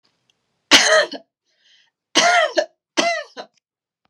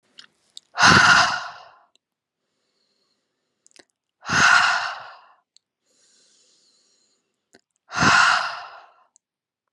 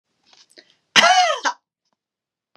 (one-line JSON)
{"three_cough_length": "4.1 s", "three_cough_amplitude": 32768, "three_cough_signal_mean_std_ratio": 0.4, "exhalation_length": "9.7 s", "exhalation_amplitude": 30399, "exhalation_signal_mean_std_ratio": 0.35, "cough_length": "2.6 s", "cough_amplitude": 32675, "cough_signal_mean_std_ratio": 0.35, "survey_phase": "beta (2021-08-13 to 2022-03-07)", "age": "45-64", "gender": "Female", "wearing_mask": "No", "symptom_none": true, "smoker_status": "Never smoked", "respiratory_condition_asthma": false, "respiratory_condition_other": false, "recruitment_source": "REACT", "submission_delay": "1 day", "covid_test_result": "Negative", "covid_test_method": "RT-qPCR", "influenza_a_test_result": "Negative", "influenza_b_test_result": "Negative"}